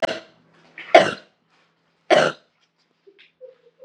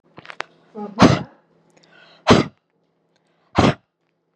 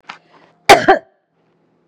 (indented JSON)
{
  "three_cough_length": "3.8 s",
  "three_cough_amplitude": 32768,
  "three_cough_signal_mean_std_ratio": 0.26,
  "exhalation_length": "4.4 s",
  "exhalation_amplitude": 32768,
  "exhalation_signal_mean_std_ratio": 0.28,
  "cough_length": "1.9 s",
  "cough_amplitude": 32768,
  "cough_signal_mean_std_ratio": 0.28,
  "survey_phase": "beta (2021-08-13 to 2022-03-07)",
  "age": "45-64",
  "gender": "Female",
  "wearing_mask": "Yes",
  "symptom_none": true,
  "smoker_status": "Ex-smoker",
  "respiratory_condition_asthma": false,
  "respiratory_condition_other": false,
  "recruitment_source": "REACT",
  "submission_delay": "1 day",
  "covid_test_result": "Negative",
  "covid_test_method": "RT-qPCR",
  "influenza_a_test_result": "Unknown/Void",
  "influenza_b_test_result": "Unknown/Void"
}